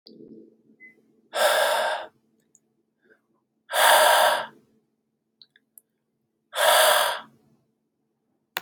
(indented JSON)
{
  "exhalation_length": "8.6 s",
  "exhalation_amplitude": 20480,
  "exhalation_signal_mean_std_ratio": 0.4,
  "survey_phase": "beta (2021-08-13 to 2022-03-07)",
  "age": "18-44",
  "gender": "Male",
  "wearing_mask": "No",
  "symptom_cough_any": true,
  "symptom_fatigue": true,
  "symptom_onset": "4 days",
  "smoker_status": "Ex-smoker",
  "respiratory_condition_asthma": false,
  "respiratory_condition_other": false,
  "recruitment_source": "REACT",
  "submission_delay": "0 days",
  "covid_test_result": "Negative",
  "covid_test_method": "RT-qPCR",
  "influenza_a_test_result": "Negative",
  "influenza_b_test_result": "Negative"
}